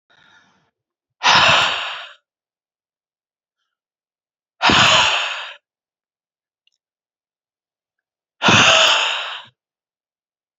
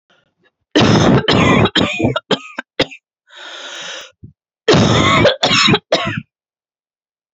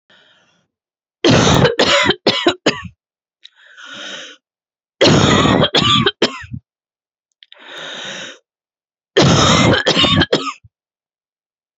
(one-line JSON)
{"exhalation_length": "10.6 s", "exhalation_amplitude": 32170, "exhalation_signal_mean_std_ratio": 0.37, "cough_length": "7.3 s", "cough_amplitude": 32123, "cough_signal_mean_std_ratio": 0.55, "three_cough_length": "11.8 s", "three_cough_amplitude": 32768, "three_cough_signal_mean_std_ratio": 0.49, "survey_phase": "beta (2021-08-13 to 2022-03-07)", "age": "18-44", "gender": "Female", "wearing_mask": "No", "symptom_cough_any": true, "symptom_new_continuous_cough": true, "symptom_shortness_of_breath": true, "symptom_fatigue": true, "symptom_headache": true, "symptom_other": true, "symptom_onset": "3 days", "smoker_status": "Never smoked", "respiratory_condition_asthma": false, "respiratory_condition_other": false, "recruitment_source": "Test and Trace", "submission_delay": "2 days", "covid_test_result": "Positive", "covid_test_method": "ePCR"}